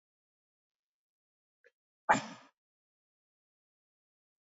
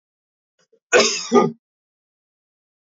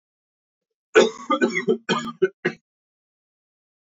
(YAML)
exhalation_length: 4.4 s
exhalation_amplitude: 9252
exhalation_signal_mean_std_ratio: 0.13
cough_length: 2.9 s
cough_amplitude: 27356
cough_signal_mean_std_ratio: 0.31
three_cough_length: 3.9 s
three_cough_amplitude: 27729
three_cough_signal_mean_std_ratio: 0.34
survey_phase: beta (2021-08-13 to 2022-03-07)
age: 18-44
gender: Male
wearing_mask: 'No'
symptom_cough_any: true
symptom_runny_or_blocked_nose: true
symptom_fatigue: true
symptom_onset: 2 days
smoker_status: Never smoked
respiratory_condition_asthma: false
respiratory_condition_other: false
recruitment_source: Test and Trace
submission_delay: 1 day
covid_test_result: Positive
covid_test_method: RT-qPCR
covid_ct_value: 21.7
covid_ct_gene: N gene
covid_ct_mean: 21.8
covid_viral_load: 70000 copies/ml
covid_viral_load_category: Low viral load (10K-1M copies/ml)